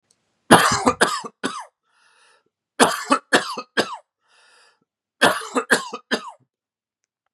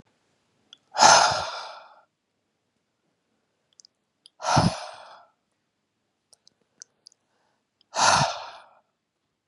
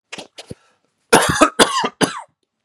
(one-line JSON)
{"three_cough_length": "7.3 s", "three_cough_amplitude": 32768, "three_cough_signal_mean_std_ratio": 0.35, "exhalation_length": "9.5 s", "exhalation_amplitude": 29177, "exhalation_signal_mean_std_ratio": 0.28, "cough_length": "2.6 s", "cough_amplitude": 32768, "cough_signal_mean_std_ratio": 0.4, "survey_phase": "beta (2021-08-13 to 2022-03-07)", "age": "18-44", "gender": "Male", "wearing_mask": "No", "symptom_none": true, "smoker_status": "Never smoked", "respiratory_condition_asthma": false, "respiratory_condition_other": false, "recruitment_source": "REACT", "submission_delay": "3 days", "covid_test_result": "Negative", "covid_test_method": "RT-qPCR", "influenza_a_test_result": "Negative", "influenza_b_test_result": "Negative"}